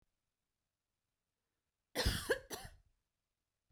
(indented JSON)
{
  "cough_length": "3.7 s",
  "cough_amplitude": 2908,
  "cough_signal_mean_std_ratio": 0.27,
  "survey_phase": "beta (2021-08-13 to 2022-03-07)",
  "age": "18-44",
  "gender": "Female",
  "wearing_mask": "No",
  "symptom_none": true,
  "smoker_status": "Never smoked",
  "respiratory_condition_asthma": false,
  "respiratory_condition_other": false,
  "recruitment_source": "REACT",
  "submission_delay": "1 day",
  "covid_test_result": "Negative",
  "covid_test_method": "RT-qPCR"
}